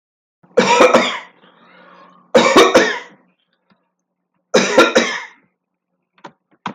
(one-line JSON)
{"three_cough_length": "6.7 s", "three_cough_amplitude": 31830, "three_cough_signal_mean_std_ratio": 0.41, "survey_phase": "alpha (2021-03-01 to 2021-08-12)", "age": "45-64", "gender": "Male", "wearing_mask": "No", "symptom_none": true, "smoker_status": "Never smoked", "respiratory_condition_asthma": false, "respiratory_condition_other": false, "recruitment_source": "REACT", "submission_delay": "1 day", "covid_test_result": "Negative", "covid_test_method": "RT-qPCR"}